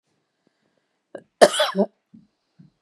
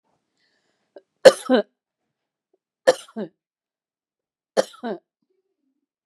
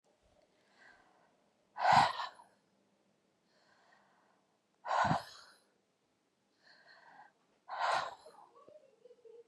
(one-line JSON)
{"cough_length": "2.8 s", "cough_amplitude": 32768, "cough_signal_mean_std_ratio": 0.24, "three_cough_length": "6.1 s", "three_cough_amplitude": 32768, "three_cough_signal_mean_std_ratio": 0.18, "exhalation_length": "9.5 s", "exhalation_amplitude": 6852, "exhalation_signal_mean_std_ratio": 0.28, "survey_phase": "beta (2021-08-13 to 2022-03-07)", "age": "45-64", "gender": "Female", "wearing_mask": "No", "symptom_none": true, "smoker_status": "Ex-smoker", "respiratory_condition_asthma": false, "respiratory_condition_other": false, "recruitment_source": "REACT", "submission_delay": "2 days", "covid_test_result": "Negative", "covid_test_method": "RT-qPCR", "influenza_a_test_result": "Negative", "influenza_b_test_result": "Negative"}